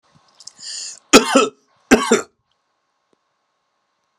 cough_length: 4.2 s
cough_amplitude: 32768
cough_signal_mean_std_ratio: 0.28
survey_phase: beta (2021-08-13 to 2022-03-07)
age: 45-64
gender: Male
wearing_mask: 'No'
symptom_none: true
smoker_status: Never smoked
respiratory_condition_asthma: false
respiratory_condition_other: false
recruitment_source: REACT
submission_delay: 5 days
covid_test_result: Negative
covid_test_method: RT-qPCR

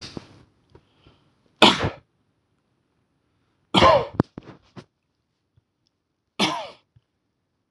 three_cough_length: 7.7 s
three_cough_amplitude: 26028
three_cough_signal_mean_std_ratio: 0.24
survey_phase: beta (2021-08-13 to 2022-03-07)
age: 45-64
gender: Male
wearing_mask: 'No'
symptom_cough_any: true
symptom_runny_or_blocked_nose: true
symptom_fatigue: true
symptom_headache: true
smoker_status: Ex-smoker
respiratory_condition_asthma: false
respiratory_condition_other: false
recruitment_source: Test and Trace
submission_delay: 1 day
covid_test_result: Positive
covid_test_method: RT-qPCR
covid_ct_value: 23.0
covid_ct_gene: ORF1ab gene
covid_ct_mean: 23.6
covid_viral_load: 18000 copies/ml
covid_viral_load_category: Low viral load (10K-1M copies/ml)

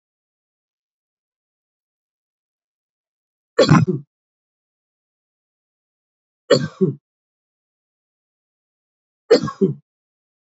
three_cough_length: 10.5 s
three_cough_amplitude: 29713
three_cough_signal_mean_std_ratio: 0.21
survey_phase: alpha (2021-03-01 to 2021-08-12)
age: 45-64
gender: Male
wearing_mask: 'Yes'
symptom_cough_any: true
symptom_fever_high_temperature: true
symptom_headache: true
symptom_change_to_sense_of_smell_or_taste: true
symptom_loss_of_taste: true
symptom_onset: 3 days
smoker_status: Never smoked
respiratory_condition_asthma: false
respiratory_condition_other: false
recruitment_source: Test and Trace
submission_delay: 2 days
covid_test_result: Positive
covid_test_method: RT-qPCR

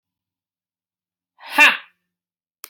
exhalation_length: 2.7 s
exhalation_amplitude: 30461
exhalation_signal_mean_std_ratio: 0.21
survey_phase: alpha (2021-03-01 to 2021-08-12)
age: 18-44
gender: Female
wearing_mask: 'No'
symptom_none: true
smoker_status: Never smoked
respiratory_condition_asthma: false
respiratory_condition_other: false
recruitment_source: REACT
submission_delay: 2 days
covid_test_result: Negative
covid_test_method: RT-qPCR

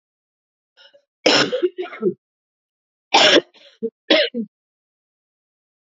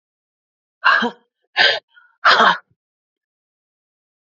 cough_length: 5.9 s
cough_amplitude: 29715
cough_signal_mean_std_ratio: 0.34
exhalation_length: 4.3 s
exhalation_amplitude: 30894
exhalation_signal_mean_std_ratio: 0.34
survey_phase: alpha (2021-03-01 to 2021-08-12)
age: 45-64
gender: Female
wearing_mask: 'No'
symptom_cough_any: true
symptom_new_continuous_cough: true
symptom_shortness_of_breath: true
symptom_abdominal_pain: true
symptom_fatigue: true
symptom_fever_high_temperature: true
symptom_change_to_sense_of_smell_or_taste: true
symptom_loss_of_taste: true
symptom_onset: 2 days
smoker_status: Never smoked
respiratory_condition_asthma: false
respiratory_condition_other: false
recruitment_source: Test and Trace
submission_delay: 1 day
covid_test_result: Positive
covid_test_method: RT-qPCR
covid_ct_value: 14.8
covid_ct_gene: ORF1ab gene
covid_ct_mean: 15.2
covid_viral_load: 10000000 copies/ml
covid_viral_load_category: High viral load (>1M copies/ml)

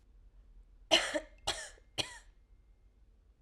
three_cough_length: 3.4 s
three_cough_amplitude: 8768
three_cough_signal_mean_std_ratio: 0.32
survey_phase: alpha (2021-03-01 to 2021-08-12)
age: 18-44
gender: Female
wearing_mask: 'No'
symptom_none: true
smoker_status: Never smoked
respiratory_condition_asthma: false
respiratory_condition_other: false
recruitment_source: REACT
submission_delay: 1 day
covid_test_result: Negative
covid_test_method: RT-qPCR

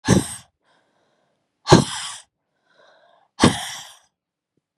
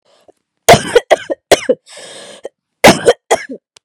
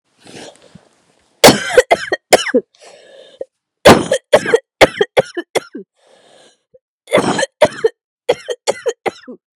exhalation_length: 4.8 s
exhalation_amplitude: 32768
exhalation_signal_mean_std_ratio: 0.27
cough_length: 3.8 s
cough_amplitude: 32768
cough_signal_mean_std_ratio: 0.36
three_cough_length: 9.6 s
three_cough_amplitude: 32768
three_cough_signal_mean_std_ratio: 0.35
survey_phase: beta (2021-08-13 to 2022-03-07)
age: 18-44
gender: Female
wearing_mask: 'No'
symptom_cough_any: true
symptom_new_continuous_cough: true
symptom_runny_or_blocked_nose: true
symptom_sore_throat: true
symptom_onset: 4 days
smoker_status: Never smoked
respiratory_condition_asthma: true
respiratory_condition_other: false
recruitment_source: Test and Trace
submission_delay: 1 day
covid_test_result: Positive
covid_test_method: RT-qPCR
covid_ct_value: 18.6
covid_ct_gene: N gene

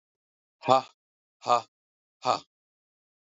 exhalation_length: 3.2 s
exhalation_amplitude: 18954
exhalation_signal_mean_std_ratio: 0.24
survey_phase: alpha (2021-03-01 to 2021-08-12)
age: 45-64
gender: Male
wearing_mask: 'No'
symptom_none: true
smoker_status: Never smoked
respiratory_condition_asthma: true
respiratory_condition_other: false
recruitment_source: REACT
submission_delay: 1 day
covid_test_result: Negative
covid_test_method: RT-qPCR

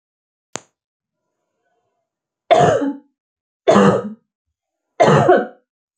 three_cough_length: 6.0 s
three_cough_amplitude: 32768
three_cough_signal_mean_std_ratio: 0.37
survey_phase: beta (2021-08-13 to 2022-03-07)
age: 45-64
gender: Female
wearing_mask: 'No'
symptom_fatigue: true
smoker_status: Never smoked
respiratory_condition_asthma: false
respiratory_condition_other: false
recruitment_source: REACT
submission_delay: 2 days
covid_test_result: Negative
covid_test_method: RT-qPCR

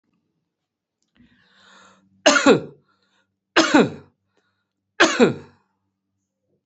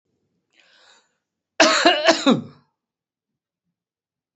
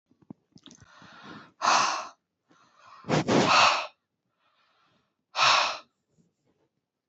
three_cough_length: 6.7 s
three_cough_amplitude: 31633
three_cough_signal_mean_std_ratio: 0.29
cough_length: 4.4 s
cough_amplitude: 28633
cough_signal_mean_std_ratio: 0.32
exhalation_length: 7.1 s
exhalation_amplitude: 13904
exhalation_signal_mean_std_ratio: 0.38
survey_phase: beta (2021-08-13 to 2022-03-07)
age: 45-64
gender: Male
wearing_mask: 'No'
symptom_fatigue: true
symptom_headache: true
symptom_onset: 12 days
smoker_status: Current smoker (e-cigarettes or vapes only)
respiratory_condition_asthma: false
respiratory_condition_other: false
recruitment_source: REACT
submission_delay: 1 day
covid_test_result: Negative
covid_test_method: RT-qPCR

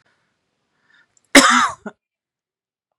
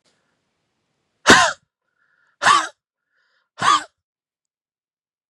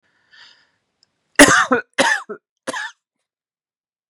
cough_length: 3.0 s
cough_amplitude: 32768
cough_signal_mean_std_ratio: 0.26
exhalation_length: 5.3 s
exhalation_amplitude: 32768
exhalation_signal_mean_std_ratio: 0.27
three_cough_length: 4.1 s
three_cough_amplitude: 32768
three_cough_signal_mean_std_ratio: 0.3
survey_phase: beta (2021-08-13 to 2022-03-07)
age: 18-44
gender: Female
wearing_mask: 'No'
symptom_none: true
smoker_status: Never smoked
respiratory_condition_asthma: false
respiratory_condition_other: false
recruitment_source: Test and Trace
submission_delay: 1 day
covid_test_result: Negative
covid_test_method: RT-qPCR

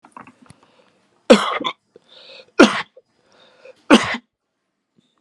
three_cough_length: 5.2 s
three_cough_amplitude: 32768
three_cough_signal_mean_std_ratio: 0.26
survey_phase: alpha (2021-03-01 to 2021-08-12)
age: 18-44
gender: Male
wearing_mask: 'No'
symptom_none: true
smoker_status: Never smoked
respiratory_condition_asthma: false
respiratory_condition_other: false
recruitment_source: REACT
submission_delay: 1 day
covid_test_result: Negative
covid_test_method: RT-qPCR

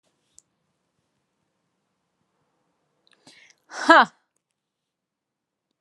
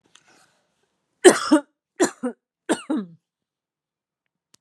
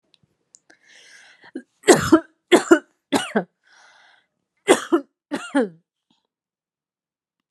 exhalation_length: 5.8 s
exhalation_amplitude: 31034
exhalation_signal_mean_std_ratio: 0.15
three_cough_length: 4.6 s
three_cough_amplitude: 32634
three_cough_signal_mean_std_ratio: 0.25
cough_length: 7.5 s
cough_amplitude: 32400
cough_signal_mean_std_ratio: 0.27
survey_phase: alpha (2021-03-01 to 2021-08-12)
age: 18-44
gender: Female
wearing_mask: 'No'
symptom_none: true
smoker_status: Never smoked
respiratory_condition_asthma: false
respiratory_condition_other: false
recruitment_source: REACT
submission_delay: 1 day
covid_test_result: Negative
covid_test_method: RT-qPCR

